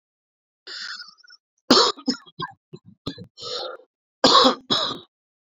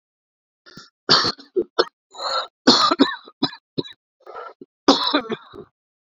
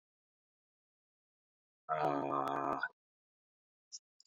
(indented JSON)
{
  "three_cough_length": "5.5 s",
  "three_cough_amplitude": 29249,
  "three_cough_signal_mean_std_ratio": 0.35,
  "cough_length": "6.1 s",
  "cough_amplitude": 32767,
  "cough_signal_mean_std_ratio": 0.38,
  "exhalation_length": "4.3 s",
  "exhalation_amplitude": 2906,
  "exhalation_signal_mean_std_ratio": 0.37,
  "survey_phase": "beta (2021-08-13 to 2022-03-07)",
  "age": "45-64",
  "gender": "Male",
  "wearing_mask": "No",
  "symptom_cough_any": true,
  "symptom_runny_or_blocked_nose": true,
  "symptom_shortness_of_breath": true,
  "symptom_sore_throat": true,
  "symptom_fatigue": true,
  "symptom_fever_high_temperature": true,
  "symptom_headache": true,
  "symptom_change_to_sense_of_smell_or_taste": true,
  "symptom_loss_of_taste": true,
  "smoker_status": "Never smoked",
  "respiratory_condition_asthma": false,
  "respiratory_condition_other": false,
  "recruitment_source": "Test and Trace",
  "submission_delay": "2 days",
  "covid_test_result": "Positive",
  "covid_test_method": "RT-qPCR"
}